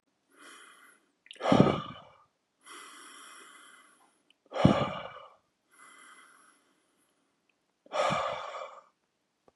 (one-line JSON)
{"exhalation_length": "9.6 s", "exhalation_amplitude": 16042, "exhalation_signal_mean_std_ratio": 0.3, "survey_phase": "beta (2021-08-13 to 2022-03-07)", "age": "45-64", "gender": "Male", "wearing_mask": "No", "symptom_none": true, "smoker_status": "Ex-smoker", "respiratory_condition_asthma": false, "respiratory_condition_other": false, "recruitment_source": "REACT", "submission_delay": "1 day", "covid_test_result": "Negative", "covid_test_method": "RT-qPCR", "influenza_a_test_result": "Negative", "influenza_b_test_result": "Negative"}